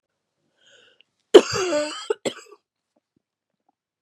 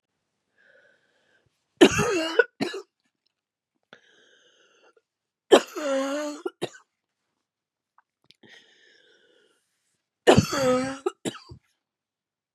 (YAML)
cough_length: 4.0 s
cough_amplitude: 32768
cough_signal_mean_std_ratio: 0.22
three_cough_length: 12.5 s
three_cough_amplitude: 27859
three_cough_signal_mean_std_ratio: 0.27
survey_phase: beta (2021-08-13 to 2022-03-07)
age: 45-64
gender: Female
wearing_mask: 'No'
symptom_cough_any: true
symptom_new_continuous_cough: true
symptom_runny_or_blocked_nose: true
symptom_shortness_of_breath: true
symptom_sore_throat: true
symptom_fatigue: true
symptom_headache: true
symptom_change_to_sense_of_smell_or_taste: true
symptom_loss_of_taste: true
symptom_onset: 1 day
smoker_status: Ex-smoker
respiratory_condition_asthma: false
respiratory_condition_other: false
recruitment_source: Test and Trace
submission_delay: 1 day
covid_test_result: Negative
covid_test_method: RT-qPCR